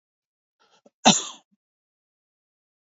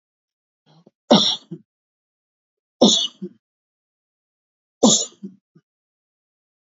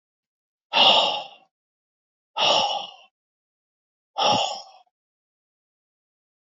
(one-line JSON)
{"cough_length": "3.0 s", "cough_amplitude": 25935, "cough_signal_mean_std_ratio": 0.17, "three_cough_length": "6.7 s", "three_cough_amplitude": 27357, "three_cough_signal_mean_std_ratio": 0.26, "exhalation_length": "6.6 s", "exhalation_amplitude": 22245, "exhalation_signal_mean_std_ratio": 0.35, "survey_phase": "beta (2021-08-13 to 2022-03-07)", "age": "45-64", "gender": "Male", "wearing_mask": "No", "symptom_none": true, "smoker_status": "Never smoked", "respiratory_condition_asthma": true, "respiratory_condition_other": true, "recruitment_source": "REACT", "submission_delay": "5 days", "covid_test_result": "Negative", "covid_test_method": "RT-qPCR", "influenza_a_test_result": "Negative", "influenza_b_test_result": "Negative"}